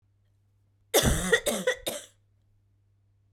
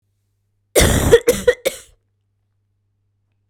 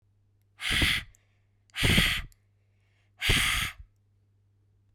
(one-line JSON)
{"three_cough_length": "3.3 s", "three_cough_amplitude": 14702, "three_cough_signal_mean_std_ratio": 0.38, "cough_length": "3.5 s", "cough_amplitude": 32768, "cough_signal_mean_std_ratio": 0.34, "exhalation_length": "4.9 s", "exhalation_amplitude": 11020, "exhalation_signal_mean_std_ratio": 0.43, "survey_phase": "beta (2021-08-13 to 2022-03-07)", "age": "18-44", "gender": "Female", "wearing_mask": "No", "symptom_cough_any": true, "symptom_other": true, "symptom_onset": "2 days", "smoker_status": "Never smoked", "respiratory_condition_asthma": false, "respiratory_condition_other": false, "recruitment_source": "Test and Trace", "submission_delay": "0 days", "covid_test_result": "Positive", "covid_test_method": "RT-qPCR", "covid_ct_value": 18.7, "covid_ct_gene": "ORF1ab gene"}